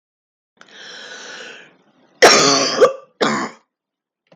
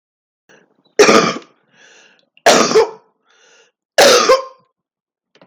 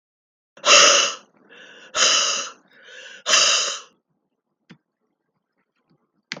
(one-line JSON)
{"cough_length": "4.4 s", "cough_amplitude": 32768, "cough_signal_mean_std_ratio": 0.38, "three_cough_length": "5.5 s", "three_cough_amplitude": 32768, "three_cough_signal_mean_std_ratio": 0.39, "exhalation_length": "6.4 s", "exhalation_amplitude": 32766, "exhalation_signal_mean_std_ratio": 0.38, "survey_phase": "beta (2021-08-13 to 2022-03-07)", "age": "45-64", "gender": "Female", "wearing_mask": "No", "symptom_none": true, "smoker_status": "Never smoked", "respiratory_condition_asthma": false, "respiratory_condition_other": false, "recruitment_source": "REACT", "submission_delay": "3 days", "covid_test_result": "Negative", "covid_test_method": "RT-qPCR", "influenza_a_test_result": "Negative", "influenza_b_test_result": "Negative"}